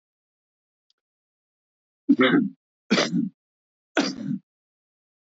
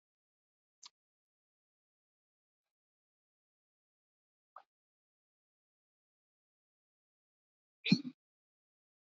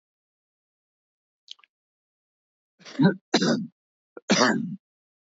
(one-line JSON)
{"three_cough_length": "5.2 s", "three_cough_amplitude": 15561, "three_cough_signal_mean_std_ratio": 0.34, "exhalation_length": "9.1 s", "exhalation_amplitude": 5982, "exhalation_signal_mean_std_ratio": 0.09, "cough_length": "5.2 s", "cough_amplitude": 15894, "cough_signal_mean_std_ratio": 0.32, "survey_phase": "beta (2021-08-13 to 2022-03-07)", "age": "65+", "gender": "Male", "wearing_mask": "No", "symptom_none": true, "smoker_status": "Never smoked", "respiratory_condition_asthma": false, "respiratory_condition_other": false, "recruitment_source": "REACT", "submission_delay": "4 days", "covid_test_result": "Negative", "covid_test_method": "RT-qPCR", "influenza_a_test_result": "Negative", "influenza_b_test_result": "Negative"}